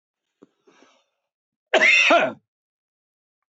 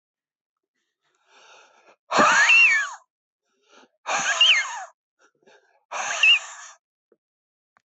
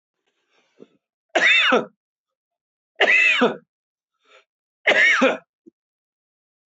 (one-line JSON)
{"cough_length": "3.5 s", "cough_amplitude": 22449, "cough_signal_mean_std_ratio": 0.33, "exhalation_length": "7.9 s", "exhalation_amplitude": 17790, "exhalation_signal_mean_std_ratio": 0.4, "three_cough_length": "6.7 s", "three_cough_amplitude": 21249, "three_cough_signal_mean_std_ratio": 0.4, "survey_phase": "beta (2021-08-13 to 2022-03-07)", "age": "65+", "gender": "Male", "wearing_mask": "No", "symptom_none": true, "smoker_status": "Ex-smoker", "respiratory_condition_asthma": false, "respiratory_condition_other": false, "recruitment_source": "REACT", "submission_delay": "2 days", "covid_test_result": "Negative", "covid_test_method": "RT-qPCR"}